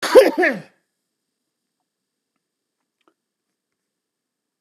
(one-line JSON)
{"cough_length": "4.6 s", "cough_amplitude": 32768, "cough_signal_mean_std_ratio": 0.22, "survey_phase": "beta (2021-08-13 to 2022-03-07)", "age": "45-64", "gender": "Male", "wearing_mask": "No", "symptom_cough_any": true, "symptom_diarrhoea": true, "symptom_onset": "2 days", "smoker_status": "Current smoker (1 to 10 cigarettes per day)", "respiratory_condition_asthma": false, "respiratory_condition_other": false, "recruitment_source": "REACT", "submission_delay": "1 day", "covid_test_result": "Negative", "covid_test_method": "RT-qPCR", "influenza_a_test_result": "Negative", "influenza_b_test_result": "Negative"}